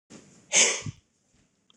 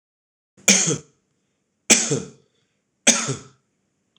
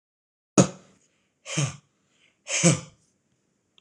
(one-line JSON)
{"cough_length": "1.8 s", "cough_amplitude": 14221, "cough_signal_mean_std_ratio": 0.32, "three_cough_length": "4.2 s", "three_cough_amplitude": 26028, "three_cough_signal_mean_std_ratio": 0.32, "exhalation_length": "3.8 s", "exhalation_amplitude": 25222, "exhalation_signal_mean_std_ratio": 0.28, "survey_phase": "beta (2021-08-13 to 2022-03-07)", "age": "45-64", "gender": "Male", "wearing_mask": "No", "symptom_none": true, "smoker_status": "Ex-smoker", "respiratory_condition_asthma": false, "respiratory_condition_other": false, "recruitment_source": "REACT", "submission_delay": "1 day", "covid_test_result": "Negative", "covid_test_method": "RT-qPCR", "influenza_a_test_result": "Negative", "influenza_b_test_result": "Negative"}